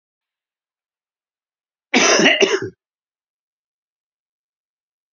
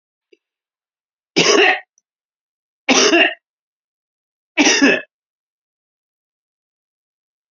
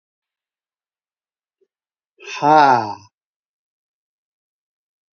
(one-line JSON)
{"cough_length": "5.1 s", "cough_amplitude": 28998, "cough_signal_mean_std_ratio": 0.28, "three_cough_length": "7.5 s", "three_cough_amplitude": 31870, "three_cough_signal_mean_std_ratio": 0.33, "exhalation_length": "5.1 s", "exhalation_amplitude": 28290, "exhalation_signal_mean_std_ratio": 0.24, "survey_phase": "beta (2021-08-13 to 2022-03-07)", "age": "65+", "gender": "Male", "wearing_mask": "No", "symptom_cough_any": true, "smoker_status": "Ex-smoker", "respiratory_condition_asthma": false, "respiratory_condition_other": false, "recruitment_source": "REACT", "submission_delay": "1 day", "covid_test_result": "Negative", "covid_test_method": "RT-qPCR", "influenza_a_test_result": "Negative", "influenza_b_test_result": "Negative"}